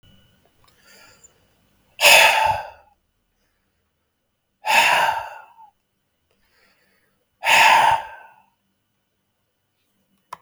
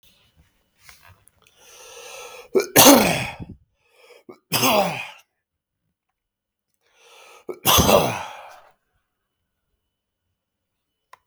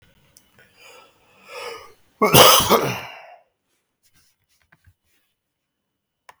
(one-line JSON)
{"exhalation_length": "10.4 s", "exhalation_amplitude": 32768, "exhalation_signal_mean_std_ratio": 0.33, "three_cough_length": "11.3 s", "three_cough_amplitude": 32768, "three_cough_signal_mean_std_ratio": 0.29, "cough_length": "6.4 s", "cough_amplitude": 32768, "cough_signal_mean_std_ratio": 0.27, "survey_phase": "beta (2021-08-13 to 2022-03-07)", "age": "45-64", "gender": "Male", "wearing_mask": "No", "symptom_shortness_of_breath": true, "symptom_fatigue": true, "symptom_change_to_sense_of_smell_or_taste": true, "symptom_loss_of_taste": true, "symptom_onset": "5 days", "smoker_status": "Never smoked", "respiratory_condition_asthma": false, "respiratory_condition_other": false, "recruitment_source": "REACT", "submission_delay": "2 days", "covid_test_result": "Positive", "covid_test_method": "RT-qPCR", "covid_ct_value": 22.0, "covid_ct_gene": "E gene", "influenza_a_test_result": "Negative", "influenza_b_test_result": "Negative"}